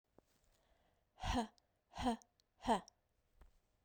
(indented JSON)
{
  "exhalation_length": "3.8 s",
  "exhalation_amplitude": 2007,
  "exhalation_signal_mean_std_ratio": 0.32,
  "survey_phase": "beta (2021-08-13 to 2022-03-07)",
  "age": "18-44",
  "gender": "Female",
  "wearing_mask": "No",
  "symptom_cough_any": true,
  "symptom_diarrhoea": true,
  "symptom_fatigue": true,
  "symptom_headache": true,
  "symptom_change_to_sense_of_smell_or_taste": true,
  "symptom_loss_of_taste": true,
  "symptom_other": true,
  "symptom_onset": "5 days",
  "smoker_status": "Never smoked",
  "respiratory_condition_asthma": false,
  "respiratory_condition_other": false,
  "recruitment_source": "Test and Trace",
  "submission_delay": "1 day",
  "covid_test_result": "Positive",
  "covid_test_method": "RT-qPCR",
  "covid_ct_value": 19.6,
  "covid_ct_gene": "ORF1ab gene",
  "covid_ct_mean": 21.0,
  "covid_viral_load": "130000 copies/ml",
  "covid_viral_load_category": "Low viral load (10K-1M copies/ml)"
}